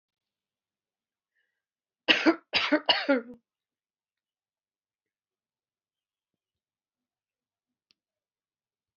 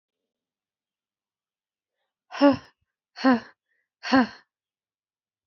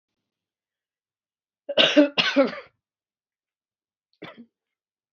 {"three_cough_length": "9.0 s", "three_cough_amplitude": 17577, "three_cough_signal_mean_std_ratio": 0.21, "exhalation_length": "5.5 s", "exhalation_amplitude": 18234, "exhalation_signal_mean_std_ratio": 0.25, "cough_length": "5.1 s", "cough_amplitude": 24098, "cough_signal_mean_std_ratio": 0.26, "survey_phase": "beta (2021-08-13 to 2022-03-07)", "age": "45-64", "gender": "Female", "wearing_mask": "No", "symptom_cough_any": true, "symptom_runny_or_blocked_nose": true, "symptom_shortness_of_breath": true, "symptom_sore_throat": true, "symptom_fatigue": true, "symptom_fever_high_temperature": true, "symptom_headache": true, "symptom_other": true, "symptom_onset": "2 days", "smoker_status": "Never smoked", "respiratory_condition_asthma": true, "respiratory_condition_other": false, "recruitment_source": "Test and Trace", "submission_delay": "2 days", "covid_test_result": "Positive", "covid_test_method": "RT-qPCR", "covid_ct_value": 27.0, "covid_ct_gene": "N gene"}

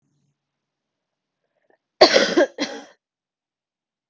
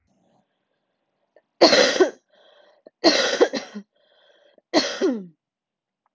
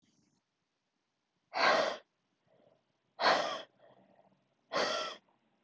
{"cough_length": "4.1 s", "cough_amplitude": 32768, "cough_signal_mean_std_ratio": 0.25, "three_cough_length": "6.1 s", "three_cough_amplitude": 32768, "three_cough_signal_mean_std_ratio": 0.35, "exhalation_length": "5.6 s", "exhalation_amplitude": 6340, "exhalation_signal_mean_std_ratio": 0.36, "survey_phase": "alpha (2021-03-01 to 2021-08-12)", "age": "18-44", "gender": "Female", "wearing_mask": "No", "symptom_cough_any": true, "symptom_new_continuous_cough": true, "symptom_shortness_of_breath": true, "symptom_fatigue": true, "symptom_fever_high_temperature": true, "symptom_headache": true, "symptom_change_to_sense_of_smell_or_taste": true, "symptom_loss_of_taste": true, "symptom_onset": "3 days", "smoker_status": "Current smoker (e-cigarettes or vapes only)", "respiratory_condition_asthma": false, "respiratory_condition_other": false, "recruitment_source": "Test and Trace", "submission_delay": "2 days", "covid_test_result": "Positive", "covid_test_method": "RT-qPCR", "covid_ct_value": 22.3, "covid_ct_gene": "ORF1ab gene", "covid_ct_mean": 22.9, "covid_viral_load": "32000 copies/ml", "covid_viral_load_category": "Low viral load (10K-1M copies/ml)"}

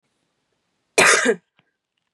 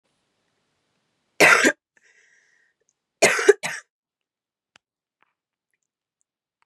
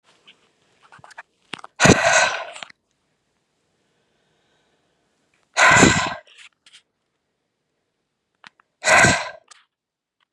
{"cough_length": "2.1 s", "cough_amplitude": 27934, "cough_signal_mean_std_ratio": 0.33, "three_cough_length": "6.7 s", "three_cough_amplitude": 29961, "three_cough_signal_mean_std_ratio": 0.23, "exhalation_length": "10.3 s", "exhalation_amplitude": 32767, "exhalation_signal_mean_std_ratio": 0.3, "survey_phase": "beta (2021-08-13 to 2022-03-07)", "age": "18-44", "gender": "Female", "wearing_mask": "No", "symptom_none": true, "symptom_onset": "3 days", "smoker_status": "Never smoked", "respiratory_condition_asthma": false, "respiratory_condition_other": false, "recruitment_source": "REACT", "submission_delay": "1 day", "covid_test_result": "Negative", "covid_test_method": "RT-qPCR", "influenza_a_test_result": "Negative", "influenza_b_test_result": "Negative"}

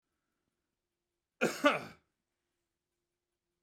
{"cough_length": "3.6 s", "cough_amplitude": 6958, "cough_signal_mean_std_ratio": 0.22, "survey_phase": "beta (2021-08-13 to 2022-03-07)", "age": "65+", "gender": "Male", "wearing_mask": "No", "symptom_none": true, "smoker_status": "Ex-smoker", "respiratory_condition_asthma": false, "respiratory_condition_other": false, "recruitment_source": "REACT", "submission_delay": "2 days", "covid_test_result": "Negative", "covid_test_method": "RT-qPCR"}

